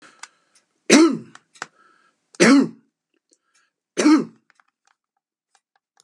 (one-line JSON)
{"three_cough_length": "6.0 s", "three_cough_amplitude": 32768, "three_cough_signal_mean_std_ratio": 0.3, "survey_phase": "beta (2021-08-13 to 2022-03-07)", "age": "65+", "gender": "Male", "wearing_mask": "No", "symptom_none": true, "smoker_status": "Ex-smoker", "respiratory_condition_asthma": false, "respiratory_condition_other": false, "recruitment_source": "REACT", "submission_delay": "2 days", "covid_test_result": "Negative", "covid_test_method": "RT-qPCR", "influenza_a_test_result": "Negative", "influenza_b_test_result": "Negative"}